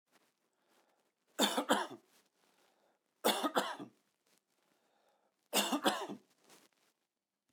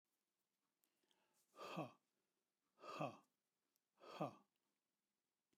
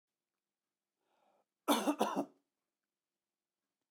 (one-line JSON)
{"three_cough_length": "7.5 s", "three_cough_amplitude": 6461, "three_cough_signal_mean_std_ratio": 0.33, "exhalation_length": "5.6 s", "exhalation_amplitude": 745, "exhalation_signal_mean_std_ratio": 0.29, "cough_length": "3.9 s", "cough_amplitude": 4752, "cough_signal_mean_std_ratio": 0.26, "survey_phase": "beta (2021-08-13 to 2022-03-07)", "age": "45-64", "gender": "Male", "wearing_mask": "No", "symptom_none": true, "smoker_status": "Never smoked", "respiratory_condition_asthma": false, "respiratory_condition_other": false, "recruitment_source": "REACT", "submission_delay": "1 day", "covid_test_result": "Negative", "covid_test_method": "RT-qPCR"}